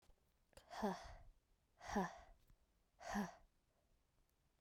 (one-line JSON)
{"exhalation_length": "4.6 s", "exhalation_amplitude": 1066, "exhalation_signal_mean_std_ratio": 0.38, "survey_phase": "beta (2021-08-13 to 2022-03-07)", "age": "18-44", "gender": "Female", "wearing_mask": "No", "symptom_runny_or_blocked_nose": true, "symptom_headache": true, "symptom_onset": "3 days", "smoker_status": "Ex-smoker", "respiratory_condition_asthma": false, "respiratory_condition_other": false, "recruitment_source": "Test and Trace", "submission_delay": "2 days", "covid_test_result": "Positive", "covid_test_method": "RT-qPCR"}